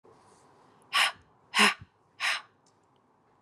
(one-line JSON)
{"exhalation_length": "3.4 s", "exhalation_amplitude": 12140, "exhalation_signal_mean_std_ratio": 0.32, "survey_phase": "beta (2021-08-13 to 2022-03-07)", "age": "18-44", "gender": "Female", "wearing_mask": "No", "symptom_runny_or_blocked_nose": true, "symptom_fatigue": true, "symptom_change_to_sense_of_smell_or_taste": true, "symptom_onset": "4 days", "smoker_status": "Never smoked", "respiratory_condition_asthma": false, "respiratory_condition_other": false, "recruitment_source": "Test and Trace", "submission_delay": "2 days", "covid_test_result": "Positive", "covid_test_method": "RT-qPCR"}